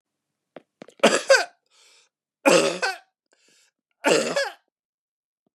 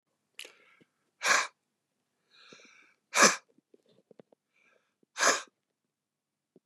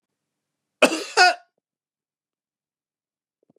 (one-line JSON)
{"three_cough_length": "5.5 s", "three_cough_amplitude": 27710, "three_cough_signal_mean_std_ratio": 0.33, "exhalation_length": "6.7 s", "exhalation_amplitude": 15841, "exhalation_signal_mean_std_ratio": 0.23, "cough_length": "3.6 s", "cough_amplitude": 32464, "cough_signal_mean_std_ratio": 0.22, "survey_phase": "beta (2021-08-13 to 2022-03-07)", "age": "45-64", "wearing_mask": "No", "symptom_cough_any": true, "symptom_sore_throat": true, "symptom_fatigue": true, "symptom_fever_high_temperature": true, "symptom_headache": true, "symptom_onset": "6 days", "smoker_status": "Never smoked", "respiratory_condition_asthma": false, "respiratory_condition_other": false, "recruitment_source": "Test and Trace", "submission_delay": "1 day", "covid_test_result": "Positive", "covid_test_method": "RT-qPCR", "covid_ct_value": 22.1, "covid_ct_gene": "ORF1ab gene", "covid_ct_mean": 22.3, "covid_viral_load": "48000 copies/ml", "covid_viral_load_category": "Low viral load (10K-1M copies/ml)"}